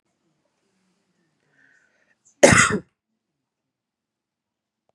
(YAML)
cough_length: 4.9 s
cough_amplitude: 32768
cough_signal_mean_std_ratio: 0.19
survey_phase: beta (2021-08-13 to 2022-03-07)
age: 45-64
gender: Female
wearing_mask: 'No'
symptom_headache: true
smoker_status: Never smoked
respiratory_condition_asthma: false
respiratory_condition_other: false
recruitment_source: REACT
submission_delay: 2 days
covid_test_result: Negative
covid_test_method: RT-qPCR
influenza_a_test_result: Negative
influenza_b_test_result: Negative